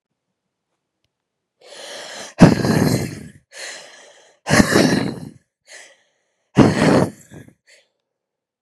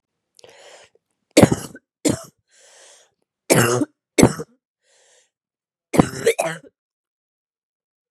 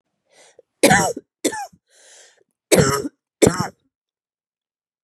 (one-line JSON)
{"exhalation_length": "8.6 s", "exhalation_amplitude": 32768, "exhalation_signal_mean_std_ratio": 0.37, "three_cough_length": "8.1 s", "three_cough_amplitude": 32768, "three_cough_signal_mean_std_ratio": 0.27, "cough_length": "5.0 s", "cough_amplitude": 32767, "cough_signal_mean_std_ratio": 0.33, "survey_phase": "beta (2021-08-13 to 2022-03-07)", "age": "18-44", "gender": "Female", "wearing_mask": "No", "symptom_cough_any": true, "symptom_new_continuous_cough": true, "symptom_runny_or_blocked_nose": true, "symptom_sore_throat": true, "symptom_abdominal_pain": true, "symptom_fatigue": true, "symptom_fever_high_temperature": true, "symptom_headache": true, "symptom_change_to_sense_of_smell_or_taste": true, "symptom_loss_of_taste": true, "symptom_onset": "2 days", "smoker_status": "Ex-smoker", "respiratory_condition_asthma": false, "respiratory_condition_other": false, "recruitment_source": "Test and Trace", "submission_delay": "2 days", "covid_test_result": "Positive", "covid_test_method": "RT-qPCR"}